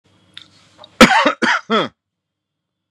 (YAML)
cough_length: 2.9 s
cough_amplitude: 32768
cough_signal_mean_std_ratio: 0.35
survey_phase: beta (2021-08-13 to 2022-03-07)
age: 45-64
gender: Male
wearing_mask: 'No'
symptom_none: true
smoker_status: Ex-smoker
respiratory_condition_asthma: false
respiratory_condition_other: false
recruitment_source: REACT
submission_delay: 2 days
covid_test_result: Negative
covid_test_method: RT-qPCR
influenza_a_test_result: Negative
influenza_b_test_result: Negative